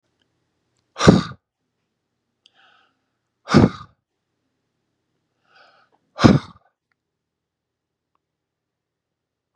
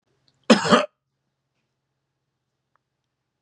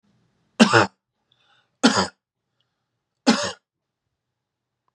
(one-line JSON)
{"exhalation_length": "9.6 s", "exhalation_amplitude": 32768, "exhalation_signal_mean_std_ratio": 0.19, "cough_length": "3.4 s", "cough_amplitude": 29886, "cough_signal_mean_std_ratio": 0.21, "three_cough_length": "4.9 s", "three_cough_amplitude": 32507, "three_cough_signal_mean_std_ratio": 0.26, "survey_phase": "beta (2021-08-13 to 2022-03-07)", "age": "45-64", "gender": "Male", "wearing_mask": "No", "symptom_none": true, "smoker_status": "Never smoked", "respiratory_condition_asthma": false, "respiratory_condition_other": false, "recruitment_source": "REACT", "submission_delay": "2 days", "covid_test_result": "Negative", "covid_test_method": "RT-qPCR", "influenza_a_test_result": "Negative", "influenza_b_test_result": "Negative"}